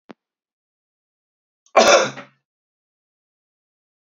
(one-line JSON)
{"cough_length": "4.1 s", "cough_amplitude": 28648, "cough_signal_mean_std_ratio": 0.22, "survey_phase": "beta (2021-08-13 to 2022-03-07)", "age": "18-44", "gender": "Male", "wearing_mask": "No", "symptom_none": true, "smoker_status": "Never smoked", "respiratory_condition_asthma": false, "respiratory_condition_other": false, "recruitment_source": "Test and Trace", "submission_delay": "2 days", "covid_test_result": "Positive", "covid_test_method": "ePCR"}